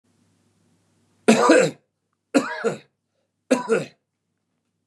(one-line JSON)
{"three_cough_length": "4.9 s", "three_cough_amplitude": 28011, "three_cough_signal_mean_std_ratio": 0.34, "survey_phase": "beta (2021-08-13 to 2022-03-07)", "age": "45-64", "gender": "Male", "wearing_mask": "No", "symptom_none": true, "smoker_status": "Ex-smoker", "respiratory_condition_asthma": false, "respiratory_condition_other": false, "recruitment_source": "REACT", "submission_delay": "2 days", "covid_test_result": "Negative", "covid_test_method": "RT-qPCR", "influenza_a_test_result": "Negative", "influenza_b_test_result": "Negative"}